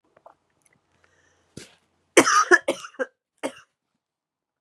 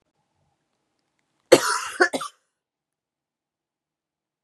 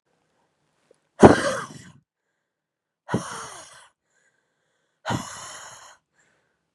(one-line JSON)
{"three_cough_length": "4.6 s", "three_cough_amplitude": 31387, "three_cough_signal_mean_std_ratio": 0.24, "cough_length": "4.4 s", "cough_amplitude": 32768, "cough_signal_mean_std_ratio": 0.21, "exhalation_length": "6.7 s", "exhalation_amplitude": 32768, "exhalation_signal_mean_std_ratio": 0.2, "survey_phase": "beta (2021-08-13 to 2022-03-07)", "age": "18-44", "gender": "Female", "wearing_mask": "No", "symptom_cough_any": true, "symptom_new_continuous_cough": true, "symptom_runny_or_blocked_nose": true, "symptom_shortness_of_breath": true, "symptom_sore_throat": true, "symptom_abdominal_pain": true, "symptom_fatigue": true, "symptom_headache": true, "symptom_onset": "4 days", "smoker_status": "Never smoked", "respiratory_condition_asthma": false, "respiratory_condition_other": false, "recruitment_source": "Test and Trace", "submission_delay": "1 day", "covid_test_result": "Positive", "covid_test_method": "RT-qPCR", "covid_ct_value": 21.4, "covid_ct_gene": "N gene"}